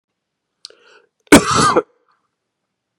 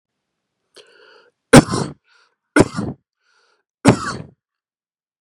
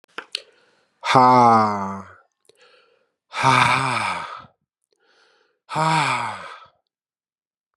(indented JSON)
{
  "cough_length": "3.0 s",
  "cough_amplitude": 32768,
  "cough_signal_mean_std_ratio": 0.28,
  "three_cough_length": "5.2 s",
  "three_cough_amplitude": 32768,
  "three_cough_signal_mean_std_ratio": 0.24,
  "exhalation_length": "7.8 s",
  "exhalation_amplitude": 29617,
  "exhalation_signal_mean_std_ratio": 0.44,
  "survey_phase": "beta (2021-08-13 to 2022-03-07)",
  "age": "45-64",
  "gender": "Male",
  "wearing_mask": "Yes",
  "symptom_cough_any": true,
  "symptom_fatigue": true,
  "symptom_headache": true,
  "symptom_change_to_sense_of_smell_or_taste": true,
  "symptom_onset": "3 days",
  "smoker_status": "Never smoked",
  "respiratory_condition_asthma": false,
  "respiratory_condition_other": false,
  "recruitment_source": "Test and Trace",
  "submission_delay": "2 days",
  "covid_test_result": "Positive",
  "covid_test_method": "RT-qPCR"
}